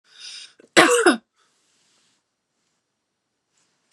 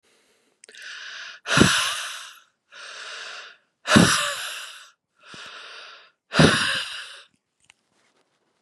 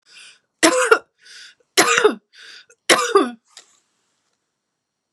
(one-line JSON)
{"cough_length": "3.9 s", "cough_amplitude": 32767, "cough_signal_mean_std_ratio": 0.25, "exhalation_length": "8.6 s", "exhalation_amplitude": 31941, "exhalation_signal_mean_std_ratio": 0.38, "three_cough_length": "5.1 s", "three_cough_amplitude": 32768, "three_cough_signal_mean_std_ratio": 0.35, "survey_phase": "beta (2021-08-13 to 2022-03-07)", "age": "45-64", "gender": "Female", "wearing_mask": "No", "symptom_none": true, "smoker_status": "Ex-smoker", "respiratory_condition_asthma": false, "respiratory_condition_other": false, "recruitment_source": "REACT", "submission_delay": "1 day", "covid_test_result": "Negative", "covid_test_method": "RT-qPCR", "influenza_a_test_result": "Negative", "influenza_b_test_result": "Negative"}